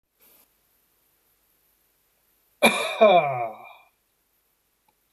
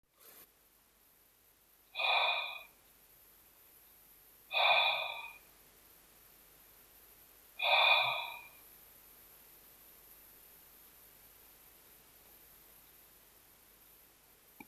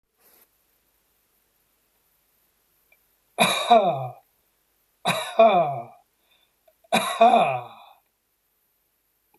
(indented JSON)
{
  "cough_length": "5.1 s",
  "cough_amplitude": 21898,
  "cough_signal_mean_std_ratio": 0.29,
  "exhalation_length": "14.7 s",
  "exhalation_amplitude": 5543,
  "exhalation_signal_mean_std_ratio": 0.34,
  "three_cough_length": "9.4 s",
  "three_cough_amplitude": 21959,
  "three_cough_signal_mean_std_ratio": 0.34,
  "survey_phase": "beta (2021-08-13 to 2022-03-07)",
  "age": "65+",
  "gender": "Male",
  "wearing_mask": "No",
  "symptom_none": true,
  "smoker_status": "Never smoked",
  "respiratory_condition_asthma": false,
  "respiratory_condition_other": false,
  "recruitment_source": "Test and Trace",
  "submission_delay": "0 days",
  "covid_test_result": "Negative",
  "covid_test_method": "LFT"
}